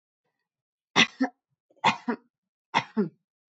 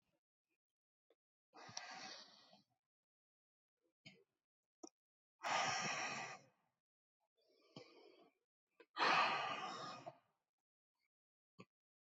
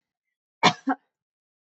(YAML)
three_cough_length: 3.6 s
three_cough_amplitude: 16968
three_cough_signal_mean_std_ratio: 0.29
exhalation_length: 12.1 s
exhalation_amplitude: 2349
exhalation_signal_mean_std_ratio: 0.32
cough_length: 1.8 s
cough_amplitude: 22365
cough_signal_mean_std_ratio: 0.22
survey_phase: beta (2021-08-13 to 2022-03-07)
age: 18-44
gender: Female
wearing_mask: 'No'
symptom_none: true
smoker_status: Never smoked
respiratory_condition_asthma: false
respiratory_condition_other: false
recruitment_source: REACT
submission_delay: 2 days
covid_test_result: Negative
covid_test_method: RT-qPCR